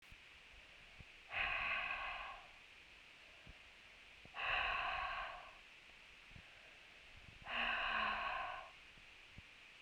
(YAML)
exhalation_length: 9.8 s
exhalation_amplitude: 1403
exhalation_signal_mean_std_ratio: 0.63
survey_phase: beta (2021-08-13 to 2022-03-07)
age: 18-44
gender: Female
wearing_mask: 'No'
symptom_cough_any: true
symptom_runny_or_blocked_nose: true
symptom_onset: 3 days
smoker_status: Never smoked
respiratory_condition_asthma: false
respiratory_condition_other: false
recruitment_source: Test and Trace
submission_delay: 1 day
covid_test_result: Positive
covid_test_method: RT-qPCR
covid_ct_value: 17.4
covid_ct_gene: ORF1ab gene